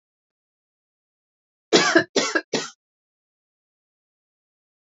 {"three_cough_length": "4.9 s", "three_cough_amplitude": 24365, "three_cough_signal_mean_std_ratio": 0.25, "survey_phase": "alpha (2021-03-01 to 2021-08-12)", "age": "18-44", "gender": "Female", "wearing_mask": "No", "symptom_cough_any": true, "symptom_headache": true, "symptom_onset": "3 days", "smoker_status": "Current smoker (1 to 10 cigarettes per day)", "respiratory_condition_asthma": true, "respiratory_condition_other": false, "recruitment_source": "Test and Trace", "submission_delay": "1 day", "covid_test_result": "Positive", "covid_test_method": "RT-qPCR", "covid_ct_value": 29.1, "covid_ct_gene": "ORF1ab gene", "covid_ct_mean": 29.6, "covid_viral_load": "200 copies/ml", "covid_viral_load_category": "Minimal viral load (< 10K copies/ml)"}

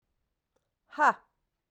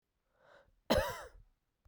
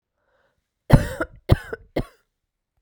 {"exhalation_length": "1.7 s", "exhalation_amplitude": 9742, "exhalation_signal_mean_std_ratio": 0.23, "cough_length": "1.9 s", "cough_amplitude": 4277, "cough_signal_mean_std_ratio": 0.3, "three_cough_length": "2.8 s", "three_cough_amplitude": 32767, "three_cough_signal_mean_std_ratio": 0.24, "survey_phase": "beta (2021-08-13 to 2022-03-07)", "age": "45-64", "gender": "Female", "wearing_mask": "No", "symptom_none": true, "smoker_status": "Never smoked", "respiratory_condition_asthma": false, "respiratory_condition_other": false, "recruitment_source": "REACT", "submission_delay": "1 day", "covid_test_result": "Negative", "covid_test_method": "RT-qPCR", "influenza_a_test_result": "Unknown/Void", "influenza_b_test_result": "Unknown/Void"}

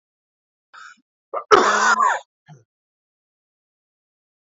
{"cough_length": "4.4 s", "cough_amplitude": 28794, "cough_signal_mean_std_ratio": 0.31, "survey_phase": "alpha (2021-03-01 to 2021-08-12)", "age": "45-64", "gender": "Male", "wearing_mask": "No", "symptom_none": true, "smoker_status": "Never smoked", "respiratory_condition_asthma": true, "respiratory_condition_other": false, "recruitment_source": "REACT", "submission_delay": "2 days", "covid_test_result": "Negative", "covid_test_method": "RT-qPCR"}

